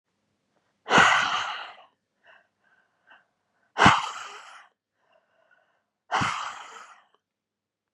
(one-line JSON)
{"exhalation_length": "7.9 s", "exhalation_amplitude": 23248, "exhalation_signal_mean_std_ratio": 0.31, "survey_phase": "beta (2021-08-13 to 2022-03-07)", "age": "45-64", "gender": "Female", "wearing_mask": "No", "symptom_none": true, "smoker_status": "Never smoked", "respiratory_condition_asthma": false, "respiratory_condition_other": false, "recruitment_source": "REACT", "submission_delay": "1 day", "covid_test_result": "Negative", "covid_test_method": "RT-qPCR", "influenza_a_test_result": "Negative", "influenza_b_test_result": "Negative"}